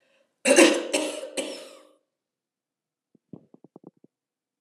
{"cough_length": "4.6 s", "cough_amplitude": 25393, "cough_signal_mean_std_ratio": 0.29, "survey_phase": "alpha (2021-03-01 to 2021-08-12)", "age": "65+", "gender": "Female", "wearing_mask": "No", "symptom_cough_any": true, "smoker_status": "Never smoked", "respiratory_condition_asthma": false, "respiratory_condition_other": false, "recruitment_source": "Test and Trace", "submission_delay": "0 days", "covid_test_result": "Negative", "covid_test_method": "LFT"}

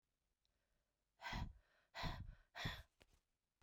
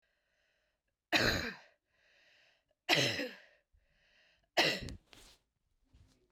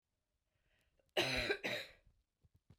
{"exhalation_length": "3.6 s", "exhalation_amplitude": 735, "exhalation_signal_mean_std_ratio": 0.42, "three_cough_length": "6.3 s", "three_cough_amplitude": 8543, "three_cough_signal_mean_std_ratio": 0.33, "cough_length": "2.8 s", "cough_amplitude": 2546, "cough_signal_mean_std_ratio": 0.38, "survey_phase": "beta (2021-08-13 to 2022-03-07)", "age": "45-64", "gender": "Female", "wearing_mask": "No", "symptom_cough_any": true, "symptom_runny_or_blocked_nose": true, "symptom_fatigue": true, "symptom_change_to_sense_of_smell_or_taste": true, "symptom_other": true, "symptom_onset": "1 day", "smoker_status": "Ex-smoker", "respiratory_condition_asthma": false, "respiratory_condition_other": false, "recruitment_source": "Test and Trace", "submission_delay": "1 day", "covid_test_result": "Positive", "covid_test_method": "ePCR"}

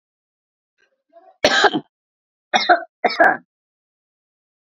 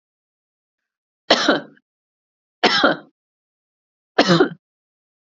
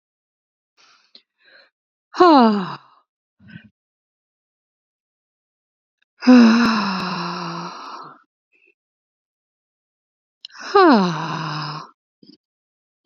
{"cough_length": "4.6 s", "cough_amplitude": 32767, "cough_signal_mean_std_ratio": 0.31, "three_cough_length": "5.4 s", "three_cough_amplitude": 30214, "three_cough_signal_mean_std_ratio": 0.31, "exhalation_length": "13.1 s", "exhalation_amplitude": 30659, "exhalation_signal_mean_std_ratio": 0.33, "survey_phase": "beta (2021-08-13 to 2022-03-07)", "age": "45-64", "gender": "Female", "wearing_mask": "No", "symptom_none": true, "smoker_status": "Never smoked", "respiratory_condition_asthma": false, "respiratory_condition_other": false, "recruitment_source": "REACT", "submission_delay": "4 days", "covid_test_result": "Negative", "covid_test_method": "RT-qPCR", "influenza_a_test_result": "Unknown/Void", "influenza_b_test_result": "Unknown/Void"}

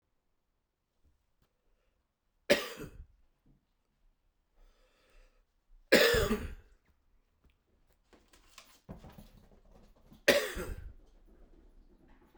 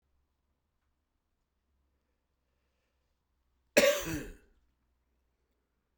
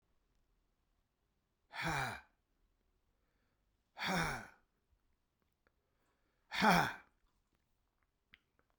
{"three_cough_length": "12.4 s", "three_cough_amplitude": 12317, "three_cough_signal_mean_std_ratio": 0.24, "cough_length": "6.0 s", "cough_amplitude": 14030, "cough_signal_mean_std_ratio": 0.19, "exhalation_length": "8.8 s", "exhalation_amplitude": 5396, "exhalation_signal_mean_std_ratio": 0.27, "survey_phase": "beta (2021-08-13 to 2022-03-07)", "age": "45-64", "gender": "Male", "wearing_mask": "No", "symptom_new_continuous_cough": true, "symptom_shortness_of_breath": true, "symptom_fatigue": true, "symptom_fever_high_temperature": true, "symptom_headache": true, "smoker_status": "Ex-smoker", "respiratory_condition_asthma": false, "respiratory_condition_other": false, "recruitment_source": "Test and Trace", "submission_delay": "2 days", "covid_test_result": "Positive", "covid_test_method": "RT-qPCR", "covid_ct_value": 13.9, "covid_ct_gene": "ORF1ab gene", "covid_ct_mean": 14.3, "covid_viral_load": "20000000 copies/ml", "covid_viral_load_category": "High viral load (>1M copies/ml)"}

